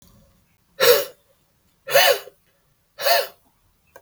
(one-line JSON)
{"exhalation_length": "4.0 s", "exhalation_amplitude": 27932, "exhalation_signal_mean_std_ratio": 0.35, "survey_phase": "beta (2021-08-13 to 2022-03-07)", "age": "45-64", "gender": "Male", "wearing_mask": "No", "symptom_none": true, "smoker_status": "Ex-smoker", "respiratory_condition_asthma": false, "respiratory_condition_other": false, "recruitment_source": "REACT", "submission_delay": "1 day", "covid_test_result": "Negative", "covid_test_method": "RT-qPCR"}